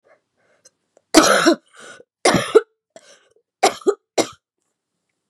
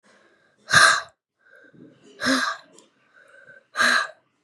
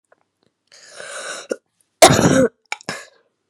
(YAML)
three_cough_length: 5.3 s
three_cough_amplitude: 32768
three_cough_signal_mean_std_ratio: 0.32
exhalation_length: 4.4 s
exhalation_amplitude: 31500
exhalation_signal_mean_std_ratio: 0.36
cough_length: 3.5 s
cough_amplitude: 32768
cough_signal_mean_std_ratio: 0.32
survey_phase: beta (2021-08-13 to 2022-03-07)
age: 18-44
gender: Female
wearing_mask: 'No'
symptom_cough_any: true
symptom_runny_or_blocked_nose: true
symptom_shortness_of_breath: true
symptom_sore_throat: true
symptom_fatigue: true
symptom_headache: true
symptom_change_to_sense_of_smell_or_taste: true
symptom_onset: 2 days
smoker_status: Never smoked
respiratory_condition_asthma: false
respiratory_condition_other: false
recruitment_source: Test and Trace
submission_delay: 1 day
covid_test_result: Positive
covid_test_method: RT-qPCR
covid_ct_value: 18.4
covid_ct_gene: N gene